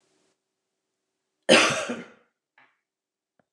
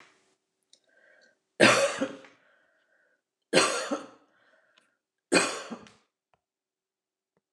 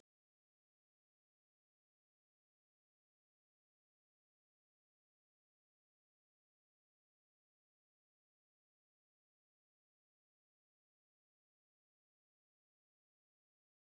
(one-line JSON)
{"cough_length": "3.5 s", "cough_amplitude": 27278, "cough_signal_mean_std_ratio": 0.25, "three_cough_length": "7.5 s", "three_cough_amplitude": 19323, "three_cough_signal_mean_std_ratio": 0.29, "exhalation_length": "13.9 s", "exhalation_amplitude": 36, "exhalation_signal_mean_std_ratio": 0.01, "survey_phase": "beta (2021-08-13 to 2022-03-07)", "age": "65+", "gender": "Female", "wearing_mask": "No", "symptom_none": true, "smoker_status": "Ex-smoker", "respiratory_condition_asthma": false, "respiratory_condition_other": false, "recruitment_source": "REACT", "submission_delay": "3 days", "covid_test_result": "Negative", "covid_test_method": "RT-qPCR", "influenza_a_test_result": "Negative", "influenza_b_test_result": "Negative"}